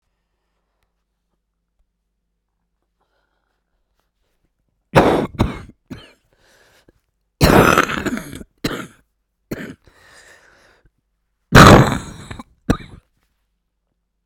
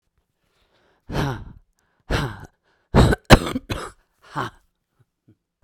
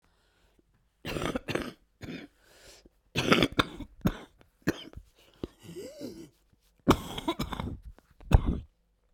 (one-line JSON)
{"three_cough_length": "14.3 s", "three_cough_amplitude": 32768, "three_cough_signal_mean_std_ratio": 0.25, "exhalation_length": "5.6 s", "exhalation_amplitude": 32768, "exhalation_signal_mean_std_ratio": 0.28, "cough_length": "9.1 s", "cough_amplitude": 19436, "cough_signal_mean_std_ratio": 0.33, "survey_phase": "beta (2021-08-13 to 2022-03-07)", "age": "45-64", "gender": "Female", "wearing_mask": "No", "symptom_cough_any": true, "symptom_new_continuous_cough": true, "symptom_runny_or_blocked_nose": true, "symptom_shortness_of_breath": true, "symptom_sore_throat": true, "symptom_fatigue": true, "symptom_fever_high_temperature": true, "symptom_headache": true, "symptom_change_to_sense_of_smell_or_taste": true, "symptom_other": true, "symptom_onset": "3 days", "smoker_status": "Ex-smoker", "respiratory_condition_asthma": false, "respiratory_condition_other": false, "recruitment_source": "Test and Trace", "submission_delay": "2 days", "covid_test_result": "Positive", "covid_test_method": "RT-qPCR", "covid_ct_value": 17.4, "covid_ct_gene": "ORF1ab gene", "covid_ct_mean": 18.3, "covid_viral_load": "1000000 copies/ml", "covid_viral_load_category": "High viral load (>1M copies/ml)"}